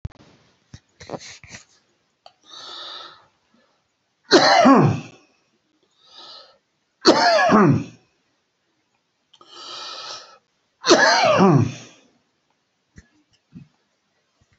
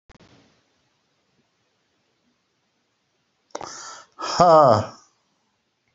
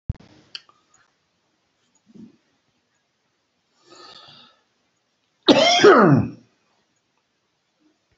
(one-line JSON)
{"three_cough_length": "14.6 s", "three_cough_amplitude": 31907, "three_cough_signal_mean_std_ratio": 0.35, "exhalation_length": "5.9 s", "exhalation_amplitude": 27505, "exhalation_signal_mean_std_ratio": 0.25, "cough_length": "8.2 s", "cough_amplitude": 27866, "cough_signal_mean_std_ratio": 0.25, "survey_phase": "alpha (2021-03-01 to 2021-08-12)", "age": "65+", "gender": "Male", "wearing_mask": "No", "symptom_none": true, "symptom_change_to_sense_of_smell_or_taste": true, "smoker_status": "Ex-smoker", "respiratory_condition_asthma": false, "respiratory_condition_other": false, "recruitment_source": "REACT", "submission_delay": "3 days", "covid_test_result": "Negative", "covid_test_method": "RT-qPCR"}